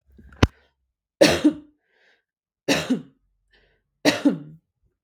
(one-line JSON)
{"three_cough_length": "5.0 s", "three_cough_amplitude": 32768, "three_cough_signal_mean_std_ratio": 0.31, "survey_phase": "beta (2021-08-13 to 2022-03-07)", "age": "18-44", "gender": "Female", "wearing_mask": "No", "symptom_none": true, "smoker_status": "Never smoked", "respiratory_condition_asthma": false, "respiratory_condition_other": false, "recruitment_source": "REACT", "submission_delay": "1 day", "covid_test_result": "Negative", "covid_test_method": "RT-qPCR", "influenza_a_test_result": "Unknown/Void", "influenza_b_test_result": "Unknown/Void"}